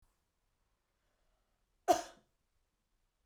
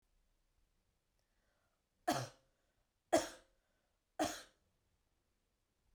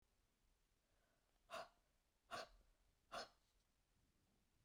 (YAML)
cough_length: 3.3 s
cough_amplitude: 5774
cough_signal_mean_std_ratio: 0.15
three_cough_length: 5.9 s
three_cough_amplitude: 4119
three_cough_signal_mean_std_ratio: 0.22
exhalation_length: 4.6 s
exhalation_amplitude: 414
exhalation_signal_mean_std_ratio: 0.33
survey_phase: beta (2021-08-13 to 2022-03-07)
age: 45-64
gender: Female
wearing_mask: 'No'
symptom_none: true
smoker_status: Never smoked
respiratory_condition_asthma: false
respiratory_condition_other: false
recruitment_source: REACT
submission_delay: 0 days
covid_test_result: Negative
covid_test_method: RT-qPCR